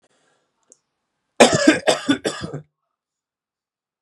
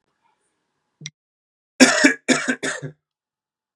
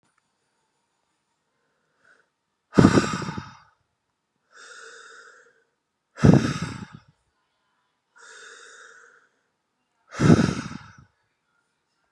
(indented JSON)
{
  "three_cough_length": "4.0 s",
  "three_cough_amplitude": 32768,
  "three_cough_signal_mean_std_ratio": 0.3,
  "cough_length": "3.8 s",
  "cough_amplitude": 32768,
  "cough_signal_mean_std_ratio": 0.3,
  "exhalation_length": "12.1 s",
  "exhalation_amplitude": 32768,
  "exhalation_signal_mean_std_ratio": 0.24,
  "survey_phase": "beta (2021-08-13 to 2022-03-07)",
  "age": "18-44",
  "gender": "Male",
  "wearing_mask": "No",
  "symptom_runny_or_blocked_nose": true,
  "symptom_abdominal_pain": true,
  "symptom_fatigue": true,
  "symptom_fever_high_temperature": true,
  "smoker_status": "Never smoked",
  "respiratory_condition_asthma": false,
  "respiratory_condition_other": false,
  "recruitment_source": "Test and Trace",
  "submission_delay": "2 days",
  "covid_test_result": "Positive",
  "covid_test_method": "LFT"
}